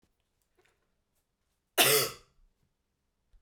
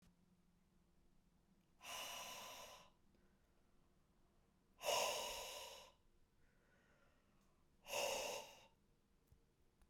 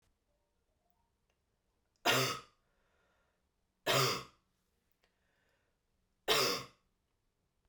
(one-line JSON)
{"cough_length": "3.4 s", "cough_amplitude": 13527, "cough_signal_mean_std_ratio": 0.24, "exhalation_length": "9.9 s", "exhalation_amplitude": 1198, "exhalation_signal_mean_std_ratio": 0.41, "three_cough_length": "7.7 s", "three_cough_amplitude": 5416, "three_cough_signal_mean_std_ratio": 0.29, "survey_phase": "beta (2021-08-13 to 2022-03-07)", "age": "18-44", "gender": "Female", "wearing_mask": "No", "symptom_cough_any": true, "symptom_runny_or_blocked_nose": true, "symptom_sore_throat": true, "symptom_abdominal_pain": true, "symptom_fatigue": true, "symptom_headache": true, "symptom_change_to_sense_of_smell_or_taste": true, "symptom_onset": "4 days", "smoker_status": "Ex-smoker", "respiratory_condition_asthma": false, "respiratory_condition_other": false, "recruitment_source": "Test and Trace", "submission_delay": "2 days", "covid_test_result": "Positive", "covid_test_method": "ePCR"}